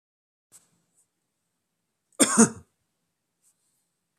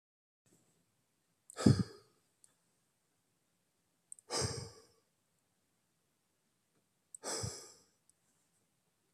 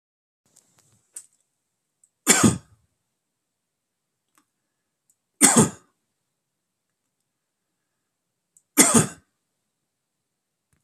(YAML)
cough_length: 4.2 s
cough_amplitude: 27333
cough_signal_mean_std_ratio: 0.18
exhalation_length: 9.1 s
exhalation_amplitude: 8740
exhalation_signal_mean_std_ratio: 0.2
three_cough_length: 10.8 s
three_cough_amplitude: 32768
three_cough_signal_mean_std_ratio: 0.21
survey_phase: beta (2021-08-13 to 2022-03-07)
age: 18-44
gender: Male
wearing_mask: 'No'
symptom_none: true
smoker_status: Ex-smoker
respiratory_condition_asthma: false
respiratory_condition_other: false
recruitment_source: REACT
submission_delay: 0 days
covid_test_result: Negative
covid_test_method: RT-qPCR
influenza_a_test_result: Negative
influenza_b_test_result: Negative